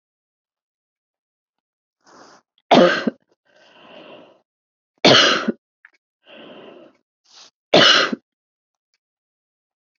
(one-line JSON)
{"three_cough_length": "10.0 s", "three_cough_amplitude": 30496, "three_cough_signal_mean_std_ratio": 0.27, "survey_phase": "beta (2021-08-13 to 2022-03-07)", "age": "45-64", "gender": "Female", "wearing_mask": "No", "symptom_new_continuous_cough": true, "symptom_runny_or_blocked_nose": true, "smoker_status": "Never smoked", "respiratory_condition_asthma": false, "respiratory_condition_other": false, "recruitment_source": "Test and Trace", "submission_delay": "1 day", "covid_test_result": "Positive", "covid_test_method": "ePCR"}